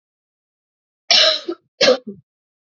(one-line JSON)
{"cough_length": "2.7 s", "cough_amplitude": 29276, "cough_signal_mean_std_ratio": 0.35, "survey_phase": "beta (2021-08-13 to 2022-03-07)", "age": "18-44", "gender": "Female", "wearing_mask": "No", "symptom_cough_any": true, "symptom_runny_or_blocked_nose": true, "symptom_shortness_of_breath": true, "symptom_sore_throat": true, "symptom_fatigue": true, "symptom_headache": true, "smoker_status": "Never smoked", "respiratory_condition_asthma": true, "respiratory_condition_other": false, "recruitment_source": "Test and Trace", "submission_delay": "1 day", "covid_test_result": "Positive", "covid_test_method": "RT-qPCR", "covid_ct_value": 29.2, "covid_ct_gene": "N gene"}